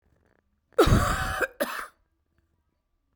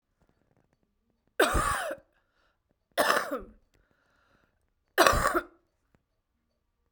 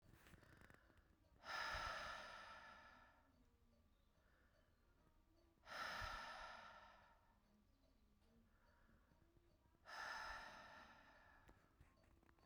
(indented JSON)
{
  "cough_length": "3.2 s",
  "cough_amplitude": 14173,
  "cough_signal_mean_std_ratio": 0.38,
  "three_cough_length": "6.9 s",
  "three_cough_amplitude": 24508,
  "three_cough_signal_mean_std_ratio": 0.32,
  "exhalation_length": "12.5 s",
  "exhalation_amplitude": 596,
  "exhalation_signal_mean_std_ratio": 0.53,
  "survey_phase": "beta (2021-08-13 to 2022-03-07)",
  "age": "45-64",
  "gender": "Female",
  "wearing_mask": "No",
  "symptom_fatigue": true,
  "symptom_headache": true,
  "symptom_change_to_sense_of_smell_or_taste": true,
  "smoker_status": "Never smoked",
  "respiratory_condition_asthma": true,
  "respiratory_condition_other": false,
  "recruitment_source": "Test and Trace",
  "submission_delay": "1 day",
  "covid_test_result": "Positive",
  "covid_test_method": "RT-qPCR",
  "covid_ct_value": 11.7,
  "covid_ct_gene": "ORF1ab gene"
}